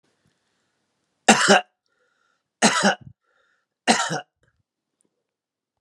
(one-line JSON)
{"three_cough_length": "5.8 s", "three_cough_amplitude": 32766, "three_cough_signal_mean_std_ratio": 0.29, "survey_phase": "beta (2021-08-13 to 2022-03-07)", "age": "65+", "gender": "Male", "wearing_mask": "No", "symptom_cough_any": true, "symptom_onset": "12 days", "smoker_status": "Never smoked", "respiratory_condition_asthma": false, "respiratory_condition_other": false, "recruitment_source": "REACT", "submission_delay": "4 days", "covid_test_result": "Negative", "covid_test_method": "RT-qPCR", "influenza_a_test_result": "Negative", "influenza_b_test_result": "Negative"}